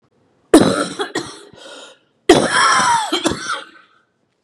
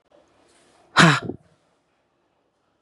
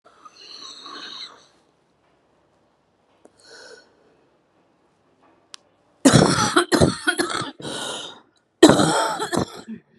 {
  "three_cough_length": "4.4 s",
  "three_cough_amplitude": 32768,
  "three_cough_signal_mean_std_ratio": 0.48,
  "exhalation_length": "2.8 s",
  "exhalation_amplitude": 32329,
  "exhalation_signal_mean_std_ratio": 0.24,
  "cough_length": "10.0 s",
  "cough_amplitude": 32768,
  "cough_signal_mean_std_ratio": 0.34,
  "survey_phase": "beta (2021-08-13 to 2022-03-07)",
  "age": "45-64",
  "gender": "Female",
  "wearing_mask": "No",
  "symptom_cough_any": true,
  "symptom_shortness_of_breath": true,
  "symptom_fatigue": true,
  "symptom_headache": true,
  "symptom_change_to_sense_of_smell_or_taste": true,
  "symptom_onset": "2 days",
  "smoker_status": "Never smoked",
  "respiratory_condition_asthma": true,
  "respiratory_condition_other": false,
  "recruitment_source": "Test and Trace",
  "submission_delay": "1 day",
  "covid_test_result": "Positive",
  "covid_test_method": "ePCR"
}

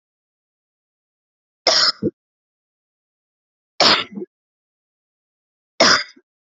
{
  "three_cough_length": "6.5 s",
  "three_cough_amplitude": 32767,
  "three_cough_signal_mean_std_ratio": 0.27,
  "survey_phase": "alpha (2021-03-01 to 2021-08-12)",
  "age": "18-44",
  "gender": "Female",
  "wearing_mask": "No",
  "symptom_none": true,
  "symptom_onset": "6 days",
  "smoker_status": "Ex-smoker",
  "respiratory_condition_asthma": false,
  "respiratory_condition_other": false,
  "recruitment_source": "REACT",
  "submission_delay": "3 days",
  "covid_test_result": "Negative",
  "covid_test_method": "RT-qPCR"
}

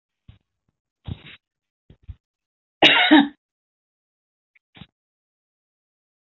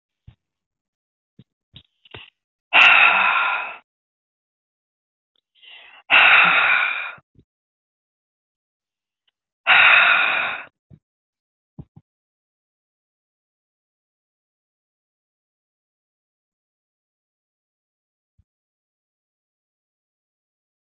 {
  "cough_length": "6.3 s",
  "cough_amplitude": 26414,
  "cough_signal_mean_std_ratio": 0.21,
  "exhalation_length": "20.9 s",
  "exhalation_amplitude": 27921,
  "exhalation_signal_mean_std_ratio": 0.28,
  "survey_phase": "beta (2021-08-13 to 2022-03-07)",
  "age": "45-64",
  "gender": "Female",
  "wearing_mask": "No",
  "symptom_none": true,
  "smoker_status": "Never smoked",
  "respiratory_condition_asthma": false,
  "respiratory_condition_other": false,
  "recruitment_source": "REACT",
  "submission_delay": "1 day",
  "covid_test_result": "Negative",
  "covid_test_method": "RT-qPCR"
}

